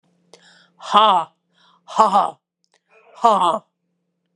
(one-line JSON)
{"exhalation_length": "4.4 s", "exhalation_amplitude": 31580, "exhalation_signal_mean_std_ratio": 0.37, "survey_phase": "beta (2021-08-13 to 2022-03-07)", "age": "45-64", "gender": "Female", "wearing_mask": "No", "symptom_cough_any": true, "symptom_sore_throat": true, "symptom_headache": true, "symptom_onset": "4 days", "smoker_status": "Never smoked", "respiratory_condition_asthma": false, "respiratory_condition_other": false, "recruitment_source": "Test and Trace", "submission_delay": "1 day", "covid_test_result": "Positive", "covid_test_method": "RT-qPCR"}